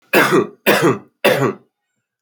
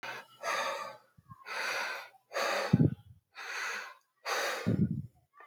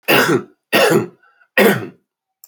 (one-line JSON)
{"cough_length": "2.2 s", "cough_amplitude": 32767, "cough_signal_mean_std_ratio": 0.55, "exhalation_length": "5.5 s", "exhalation_amplitude": 9640, "exhalation_signal_mean_std_ratio": 0.57, "three_cough_length": "2.5 s", "three_cough_amplitude": 30599, "three_cough_signal_mean_std_ratio": 0.53, "survey_phase": "alpha (2021-03-01 to 2021-08-12)", "age": "45-64", "gender": "Male", "wearing_mask": "No", "symptom_none": true, "smoker_status": "Current smoker (11 or more cigarettes per day)", "respiratory_condition_asthma": false, "respiratory_condition_other": false, "recruitment_source": "REACT", "submission_delay": "1 day", "covid_test_result": "Negative", "covid_test_method": "RT-qPCR"}